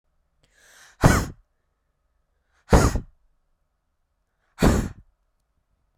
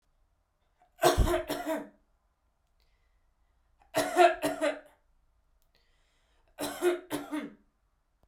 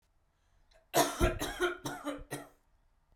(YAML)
exhalation_length: 6.0 s
exhalation_amplitude: 28875
exhalation_signal_mean_std_ratio: 0.27
three_cough_length: 8.3 s
three_cough_amplitude: 12075
three_cough_signal_mean_std_ratio: 0.35
cough_length: 3.2 s
cough_amplitude: 7790
cough_signal_mean_std_ratio: 0.43
survey_phase: beta (2021-08-13 to 2022-03-07)
age: 18-44
gender: Female
wearing_mask: 'No'
symptom_none: true
smoker_status: Never smoked
respiratory_condition_asthma: false
respiratory_condition_other: false
recruitment_source: REACT
submission_delay: 2 days
covid_test_result: Negative
covid_test_method: RT-qPCR
influenza_a_test_result: Negative
influenza_b_test_result: Negative